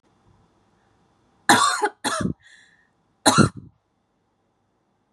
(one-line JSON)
{"cough_length": "5.1 s", "cough_amplitude": 30741, "cough_signal_mean_std_ratio": 0.3, "survey_phase": "beta (2021-08-13 to 2022-03-07)", "age": "18-44", "gender": "Female", "wearing_mask": "No", "symptom_none": true, "smoker_status": "Never smoked", "respiratory_condition_asthma": false, "respiratory_condition_other": false, "recruitment_source": "REACT", "submission_delay": "1 day", "covid_test_result": "Negative", "covid_test_method": "RT-qPCR", "influenza_a_test_result": "Negative", "influenza_b_test_result": "Negative"}